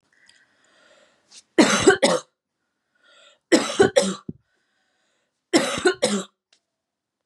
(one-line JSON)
{"three_cough_length": "7.3 s", "three_cough_amplitude": 28007, "three_cough_signal_mean_std_ratio": 0.35, "survey_phase": "beta (2021-08-13 to 2022-03-07)", "age": "18-44", "gender": "Female", "wearing_mask": "No", "symptom_none": true, "smoker_status": "Never smoked", "respiratory_condition_asthma": false, "respiratory_condition_other": false, "recruitment_source": "REACT", "submission_delay": "0 days", "covid_test_result": "Negative", "covid_test_method": "RT-qPCR", "influenza_a_test_result": "Negative", "influenza_b_test_result": "Negative"}